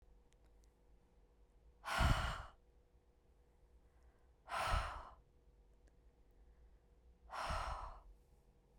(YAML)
exhalation_length: 8.8 s
exhalation_amplitude: 3071
exhalation_signal_mean_std_ratio: 0.38
survey_phase: beta (2021-08-13 to 2022-03-07)
age: 45-64
gender: Female
wearing_mask: 'No'
symptom_none: true
smoker_status: Never smoked
respiratory_condition_asthma: false
respiratory_condition_other: false
recruitment_source: REACT
submission_delay: 1 day
covid_test_result: Negative
covid_test_method: RT-qPCR